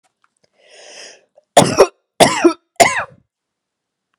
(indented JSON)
{
  "three_cough_length": "4.2 s",
  "three_cough_amplitude": 32768,
  "three_cough_signal_mean_std_ratio": 0.32,
  "survey_phase": "beta (2021-08-13 to 2022-03-07)",
  "age": "18-44",
  "gender": "Female",
  "wearing_mask": "No",
  "symptom_runny_or_blocked_nose": true,
  "symptom_headache": true,
  "smoker_status": "Ex-smoker",
  "respiratory_condition_asthma": false,
  "respiratory_condition_other": false,
  "recruitment_source": "Test and Trace",
  "submission_delay": "1 day",
  "covid_test_result": "Positive",
  "covid_test_method": "RT-qPCR"
}